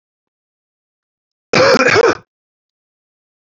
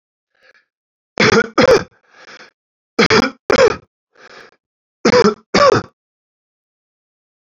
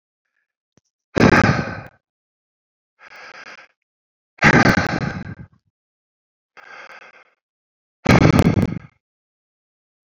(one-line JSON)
{"cough_length": "3.4 s", "cough_amplitude": 31413, "cough_signal_mean_std_ratio": 0.34, "three_cough_length": "7.4 s", "three_cough_amplitude": 31310, "three_cough_signal_mean_std_ratio": 0.37, "exhalation_length": "10.1 s", "exhalation_amplitude": 31380, "exhalation_signal_mean_std_ratio": 0.32, "survey_phase": "beta (2021-08-13 to 2022-03-07)", "age": "18-44", "gender": "Male", "wearing_mask": "No", "symptom_cough_any": true, "symptom_runny_or_blocked_nose": true, "symptom_abdominal_pain": true, "symptom_change_to_sense_of_smell_or_taste": true, "symptom_loss_of_taste": true, "symptom_onset": "4 days", "smoker_status": "Ex-smoker", "respiratory_condition_asthma": false, "respiratory_condition_other": false, "recruitment_source": "Test and Trace", "submission_delay": "1 day", "covid_test_result": "Positive", "covid_test_method": "RT-qPCR", "covid_ct_value": 12.4, "covid_ct_gene": "ORF1ab gene", "covid_ct_mean": 13.1, "covid_viral_load": "50000000 copies/ml", "covid_viral_load_category": "High viral load (>1M copies/ml)"}